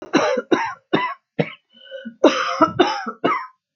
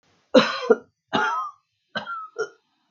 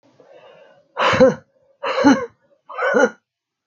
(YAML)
cough_length: 3.8 s
cough_amplitude: 27426
cough_signal_mean_std_ratio: 0.53
three_cough_length: 2.9 s
three_cough_amplitude: 26619
three_cough_signal_mean_std_ratio: 0.39
exhalation_length: 3.7 s
exhalation_amplitude: 27099
exhalation_signal_mean_std_ratio: 0.44
survey_phase: beta (2021-08-13 to 2022-03-07)
age: 45-64
gender: Female
wearing_mask: 'No'
symptom_cough_any: true
symptom_runny_or_blocked_nose: true
symptom_sore_throat: true
symptom_fatigue: true
symptom_fever_high_temperature: true
symptom_headache: true
symptom_onset: 3 days
smoker_status: Ex-smoker
respiratory_condition_asthma: false
respiratory_condition_other: false
recruitment_source: Test and Trace
submission_delay: 2 days
covid_test_result: Positive
covid_test_method: RT-qPCR
covid_ct_value: 17.9
covid_ct_gene: ORF1ab gene
covid_ct_mean: 18.7
covid_viral_load: 760000 copies/ml
covid_viral_load_category: Low viral load (10K-1M copies/ml)